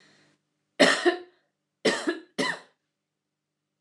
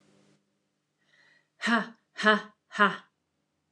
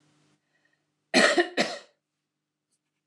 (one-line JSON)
{"three_cough_length": "3.8 s", "three_cough_amplitude": 19503, "three_cough_signal_mean_std_ratio": 0.33, "exhalation_length": "3.7 s", "exhalation_amplitude": 15815, "exhalation_signal_mean_std_ratio": 0.29, "cough_length": "3.1 s", "cough_amplitude": 17786, "cough_signal_mean_std_ratio": 0.3, "survey_phase": "beta (2021-08-13 to 2022-03-07)", "age": "45-64", "gender": "Female", "wearing_mask": "No", "symptom_none": true, "smoker_status": "Ex-smoker", "respiratory_condition_asthma": false, "respiratory_condition_other": false, "recruitment_source": "REACT", "submission_delay": "1 day", "covid_test_result": "Negative", "covid_test_method": "RT-qPCR", "influenza_a_test_result": "Negative", "influenza_b_test_result": "Negative"}